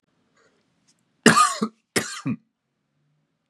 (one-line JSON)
{"cough_length": "3.5 s", "cough_amplitude": 32483, "cough_signal_mean_std_ratio": 0.29, "survey_phase": "beta (2021-08-13 to 2022-03-07)", "age": "18-44", "gender": "Male", "wearing_mask": "No", "symptom_cough_any": true, "symptom_headache": true, "symptom_onset": "9 days", "smoker_status": "Never smoked", "respiratory_condition_asthma": false, "respiratory_condition_other": false, "recruitment_source": "Test and Trace", "submission_delay": "6 days", "covid_test_result": "Negative", "covid_test_method": "ePCR"}